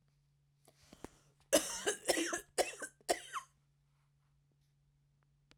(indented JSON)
{
  "cough_length": "5.6 s",
  "cough_amplitude": 5039,
  "cough_signal_mean_std_ratio": 0.32,
  "survey_phase": "beta (2021-08-13 to 2022-03-07)",
  "age": "45-64",
  "gender": "Female",
  "wearing_mask": "No",
  "symptom_none": true,
  "smoker_status": "Ex-smoker",
  "respiratory_condition_asthma": false,
  "respiratory_condition_other": false,
  "recruitment_source": "REACT",
  "submission_delay": "3 days",
  "covid_test_result": "Negative",
  "covid_test_method": "RT-qPCR",
  "influenza_a_test_result": "Negative",
  "influenza_b_test_result": "Negative"
}